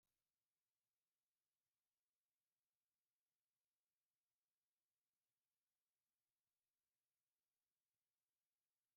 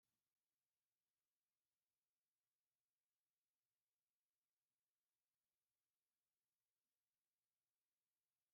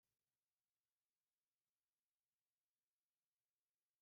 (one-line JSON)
{"exhalation_length": "9.0 s", "exhalation_amplitude": 3, "exhalation_signal_mean_std_ratio": 0.34, "three_cough_length": "8.5 s", "three_cough_amplitude": 3, "three_cough_signal_mean_std_ratio": 0.33, "cough_length": "4.0 s", "cough_amplitude": 3, "cough_signal_mean_std_ratio": 0.32, "survey_phase": "beta (2021-08-13 to 2022-03-07)", "age": "65+", "gender": "Female", "wearing_mask": "No", "symptom_none": true, "smoker_status": "Never smoked", "respiratory_condition_asthma": false, "respiratory_condition_other": false, "recruitment_source": "REACT", "submission_delay": "2 days", "covid_test_result": "Negative", "covid_test_method": "RT-qPCR", "influenza_a_test_result": "Negative", "influenza_b_test_result": "Negative"}